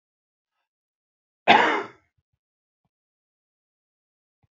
{"cough_length": "4.5 s", "cough_amplitude": 27309, "cough_signal_mean_std_ratio": 0.2, "survey_phase": "beta (2021-08-13 to 2022-03-07)", "age": "65+", "gender": "Male", "wearing_mask": "No", "symptom_none": true, "smoker_status": "Current smoker (11 or more cigarettes per day)", "respiratory_condition_asthma": false, "respiratory_condition_other": false, "recruitment_source": "REACT", "submission_delay": "0 days", "covid_test_result": "Negative", "covid_test_method": "RT-qPCR", "influenza_a_test_result": "Negative", "influenza_b_test_result": "Negative"}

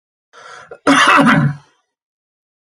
{"cough_length": "2.6 s", "cough_amplitude": 31453, "cough_signal_mean_std_ratio": 0.44, "survey_phase": "alpha (2021-03-01 to 2021-08-12)", "age": "45-64", "gender": "Male", "wearing_mask": "No", "symptom_none": true, "smoker_status": "Never smoked", "respiratory_condition_asthma": false, "respiratory_condition_other": false, "recruitment_source": "REACT", "submission_delay": "1 day", "covid_test_result": "Negative", "covid_test_method": "RT-qPCR"}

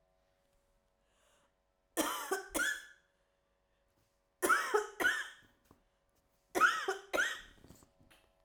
{"three_cough_length": "8.4 s", "three_cough_amplitude": 4779, "three_cough_signal_mean_std_ratio": 0.38, "survey_phase": "beta (2021-08-13 to 2022-03-07)", "age": "18-44", "gender": "Female", "wearing_mask": "No", "symptom_cough_any": true, "symptom_runny_or_blocked_nose": true, "symptom_shortness_of_breath": true, "symptom_sore_throat": true, "symptom_abdominal_pain": true, "symptom_fatigue": true, "symptom_fever_high_temperature": true, "symptom_headache": true, "symptom_change_to_sense_of_smell_or_taste": true, "symptom_onset": "3 days", "smoker_status": "Never smoked", "respiratory_condition_asthma": false, "respiratory_condition_other": false, "recruitment_source": "Test and Trace", "submission_delay": "1 day", "covid_test_result": "Positive", "covid_test_method": "RT-qPCR"}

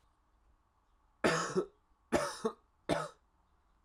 {"three_cough_length": "3.8 s", "three_cough_amplitude": 5581, "three_cough_signal_mean_std_ratio": 0.37, "survey_phase": "alpha (2021-03-01 to 2021-08-12)", "age": "18-44", "gender": "Male", "wearing_mask": "No", "symptom_cough_any": true, "symptom_fever_high_temperature": true, "smoker_status": "Prefer not to say", "respiratory_condition_asthma": false, "respiratory_condition_other": false, "recruitment_source": "Test and Trace", "submission_delay": "2 days", "covid_test_result": "Positive", "covid_test_method": "LFT"}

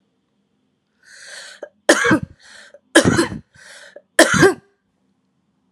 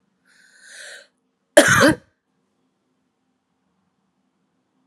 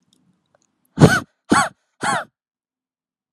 {"three_cough_length": "5.7 s", "three_cough_amplitude": 32768, "three_cough_signal_mean_std_ratio": 0.33, "cough_length": "4.9 s", "cough_amplitude": 32768, "cough_signal_mean_std_ratio": 0.22, "exhalation_length": "3.3 s", "exhalation_amplitude": 32768, "exhalation_signal_mean_std_ratio": 0.29, "survey_phase": "alpha (2021-03-01 to 2021-08-12)", "age": "18-44", "gender": "Female", "wearing_mask": "No", "symptom_cough_any": true, "symptom_fatigue": true, "symptom_fever_high_temperature": true, "symptom_headache": true, "symptom_change_to_sense_of_smell_or_taste": true, "symptom_loss_of_taste": true, "smoker_status": "Ex-smoker", "respiratory_condition_asthma": false, "respiratory_condition_other": false, "recruitment_source": "Test and Trace", "submission_delay": "3 days", "covid_test_result": "Positive", "covid_test_method": "RT-qPCR", "covid_ct_value": 24.9, "covid_ct_gene": "ORF1ab gene", "covid_ct_mean": 25.4, "covid_viral_load": "4700 copies/ml", "covid_viral_load_category": "Minimal viral load (< 10K copies/ml)"}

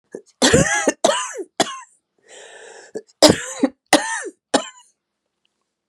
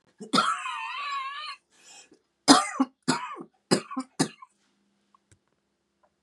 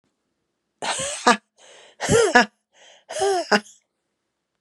{"cough_length": "5.9 s", "cough_amplitude": 32768, "cough_signal_mean_std_ratio": 0.37, "three_cough_length": "6.2 s", "three_cough_amplitude": 26951, "three_cough_signal_mean_std_ratio": 0.35, "exhalation_length": "4.6 s", "exhalation_amplitude": 32767, "exhalation_signal_mean_std_ratio": 0.38, "survey_phase": "beta (2021-08-13 to 2022-03-07)", "age": "45-64", "gender": "Female", "wearing_mask": "No", "symptom_runny_or_blocked_nose": true, "symptom_fatigue": true, "symptom_change_to_sense_of_smell_or_taste": true, "symptom_onset": "3 days", "smoker_status": "Never smoked", "respiratory_condition_asthma": false, "respiratory_condition_other": false, "recruitment_source": "REACT", "submission_delay": "1 day", "covid_test_result": "Positive", "covid_test_method": "RT-qPCR", "covid_ct_value": 20.0, "covid_ct_gene": "E gene", "influenza_a_test_result": "Negative", "influenza_b_test_result": "Negative"}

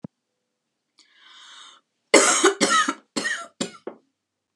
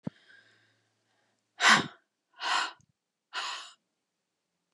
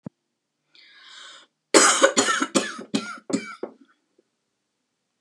{"three_cough_length": "4.6 s", "three_cough_amplitude": 32139, "three_cough_signal_mean_std_ratio": 0.36, "exhalation_length": "4.7 s", "exhalation_amplitude": 12969, "exhalation_signal_mean_std_ratio": 0.27, "cough_length": "5.2 s", "cough_amplitude": 30700, "cough_signal_mean_std_ratio": 0.34, "survey_phase": "beta (2021-08-13 to 2022-03-07)", "age": "45-64", "gender": "Female", "wearing_mask": "No", "symptom_other": true, "smoker_status": "Never smoked", "respiratory_condition_asthma": false, "respiratory_condition_other": false, "recruitment_source": "REACT", "submission_delay": "2 days", "covid_test_result": "Negative", "covid_test_method": "RT-qPCR", "influenza_a_test_result": "Unknown/Void", "influenza_b_test_result": "Unknown/Void"}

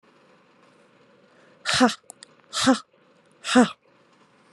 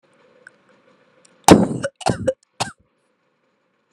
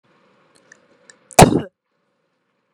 {"exhalation_length": "4.5 s", "exhalation_amplitude": 23627, "exhalation_signal_mean_std_ratio": 0.3, "three_cough_length": "3.9 s", "three_cough_amplitude": 32768, "three_cough_signal_mean_std_ratio": 0.25, "cough_length": "2.7 s", "cough_amplitude": 32768, "cough_signal_mean_std_ratio": 0.2, "survey_phase": "beta (2021-08-13 to 2022-03-07)", "age": "18-44", "gender": "Female", "wearing_mask": "No", "symptom_none": true, "symptom_onset": "13 days", "smoker_status": "Never smoked", "respiratory_condition_asthma": false, "respiratory_condition_other": false, "recruitment_source": "REACT", "submission_delay": "3 days", "covid_test_result": "Negative", "covid_test_method": "RT-qPCR", "influenza_a_test_result": "Negative", "influenza_b_test_result": "Negative"}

